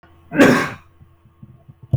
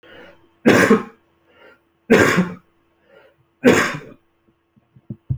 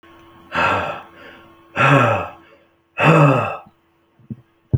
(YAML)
cough_length: 2.0 s
cough_amplitude: 28015
cough_signal_mean_std_ratio: 0.36
three_cough_length: 5.4 s
three_cough_amplitude: 28763
three_cough_signal_mean_std_ratio: 0.37
exhalation_length: 4.8 s
exhalation_amplitude: 27822
exhalation_signal_mean_std_ratio: 0.47
survey_phase: beta (2021-08-13 to 2022-03-07)
age: 45-64
gender: Male
wearing_mask: 'No'
symptom_none: true
smoker_status: Never smoked
respiratory_condition_asthma: false
respiratory_condition_other: false
recruitment_source: REACT
submission_delay: 1 day
covid_test_result: Negative
covid_test_method: RT-qPCR